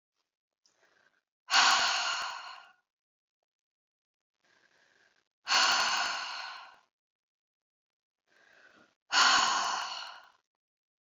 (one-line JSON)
{"exhalation_length": "11.0 s", "exhalation_amplitude": 9796, "exhalation_signal_mean_std_ratio": 0.38, "survey_phase": "beta (2021-08-13 to 2022-03-07)", "age": "45-64", "gender": "Female", "wearing_mask": "No", "symptom_none": true, "smoker_status": "Ex-smoker", "respiratory_condition_asthma": false, "respiratory_condition_other": false, "recruitment_source": "REACT", "submission_delay": "4 days", "covid_test_result": "Negative", "covid_test_method": "RT-qPCR"}